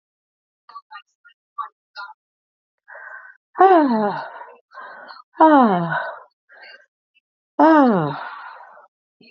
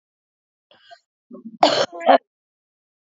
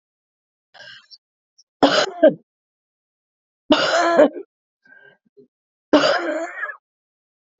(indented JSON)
{
  "exhalation_length": "9.3 s",
  "exhalation_amplitude": 30359,
  "exhalation_signal_mean_std_ratio": 0.37,
  "cough_length": "3.1 s",
  "cough_amplitude": 30296,
  "cough_signal_mean_std_ratio": 0.27,
  "three_cough_length": "7.6 s",
  "three_cough_amplitude": 28116,
  "three_cough_signal_mean_std_ratio": 0.35,
  "survey_phase": "alpha (2021-03-01 to 2021-08-12)",
  "age": "45-64",
  "gender": "Female",
  "wearing_mask": "No",
  "symptom_cough_any": true,
  "symptom_new_continuous_cough": true,
  "symptom_shortness_of_breath": true,
  "symptom_diarrhoea": true,
  "symptom_fatigue": true,
  "symptom_fever_high_temperature": true,
  "symptom_headache": true,
  "symptom_change_to_sense_of_smell_or_taste": true,
  "symptom_loss_of_taste": true,
  "symptom_onset": "3 days",
  "smoker_status": "Ex-smoker",
  "respiratory_condition_asthma": false,
  "respiratory_condition_other": false,
  "recruitment_source": "Test and Trace",
  "submission_delay": "1 day",
  "covid_test_result": "Positive",
  "covid_test_method": "RT-qPCR",
  "covid_ct_value": 15.5,
  "covid_ct_gene": "ORF1ab gene",
  "covid_ct_mean": 16.1,
  "covid_viral_load": "5300000 copies/ml",
  "covid_viral_load_category": "High viral load (>1M copies/ml)"
}